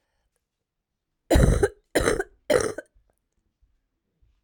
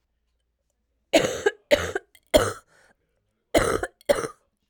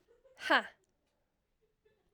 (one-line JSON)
{"three_cough_length": "4.4 s", "three_cough_amplitude": 18499, "three_cough_signal_mean_std_ratio": 0.34, "cough_length": "4.7 s", "cough_amplitude": 25583, "cough_signal_mean_std_ratio": 0.35, "exhalation_length": "2.1 s", "exhalation_amplitude": 6974, "exhalation_signal_mean_std_ratio": 0.22, "survey_phase": "alpha (2021-03-01 to 2021-08-12)", "age": "18-44", "gender": "Female", "wearing_mask": "No", "symptom_cough_any": true, "symptom_shortness_of_breath": true, "symptom_fatigue": true, "symptom_headache": true, "symptom_change_to_sense_of_smell_or_taste": true, "symptom_onset": "2 days", "smoker_status": "Never smoked", "respiratory_condition_asthma": false, "respiratory_condition_other": false, "recruitment_source": "Test and Trace", "submission_delay": "2 days", "covid_test_result": "Positive", "covid_test_method": "RT-qPCR", "covid_ct_value": 15.2, "covid_ct_gene": "ORF1ab gene"}